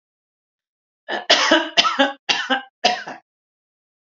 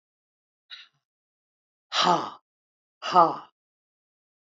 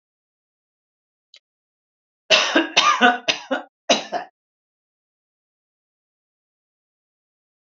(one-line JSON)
{"cough_length": "4.1 s", "cough_amplitude": 29988, "cough_signal_mean_std_ratio": 0.41, "exhalation_length": "4.4 s", "exhalation_amplitude": 21034, "exhalation_signal_mean_std_ratio": 0.26, "three_cough_length": "7.8 s", "three_cough_amplitude": 30824, "three_cough_signal_mean_std_ratio": 0.28, "survey_phase": "alpha (2021-03-01 to 2021-08-12)", "age": "65+", "gender": "Female", "wearing_mask": "No", "symptom_none": true, "smoker_status": "Never smoked", "respiratory_condition_asthma": false, "respiratory_condition_other": false, "recruitment_source": "REACT", "submission_delay": "1 day", "covid_test_result": "Negative", "covid_test_method": "RT-qPCR"}